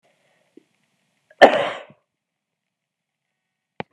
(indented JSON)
{
  "cough_length": "3.9 s",
  "cough_amplitude": 32768,
  "cough_signal_mean_std_ratio": 0.17,
  "survey_phase": "beta (2021-08-13 to 2022-03-07)",
  "age": "65+",
  "gender": "Male",
  "wearing_mask": "No",
  "symptom_none": true,
  "symptom_onset": "12 days",
  "smoker_status": "Never smoked",
  "respiratory_condition_asthma": false,
  "respiratory_condition_other": false,
  "recruitment_source": "REACT",
  "submission_delay": "2 days",
  "covid_test_result": "Negative",
  "covid_test_method": "RT-qPCR"
}